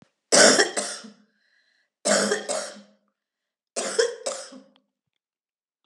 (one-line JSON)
{"three_cough_length": "5.9 s", "three_cough_amplitude": 27292, "three_cough_signal_mean_std_ratio": 0.37, "survey_phase": "beta (2021-08-13 to 2022-03-07)", "age": "45-64", "gender": "Female", "wearing_mask": "No", "symptom_cough_any": true, "symptom_runny_or_blocked_nose": true, "symptom_onset": "7 days", "smoker_status": "Ex-smoker", "respiratory_condition_asthma": false, "respiratory_condition_other": false, "recruitment_source": "Test and Trace", "submission_delay": "2 days", "covid_test_result": "Positive", "covid_test_method": "RT-qPCR", "covid_ct_value": 11.0, "covid_ct_gene": "ORF1ab gene", "covid_ct_mean": 11.1, "covid_viral_load": "220000000 copies/ml", "covid_viral_load_category": "High viral load (>1M copies/ml)"}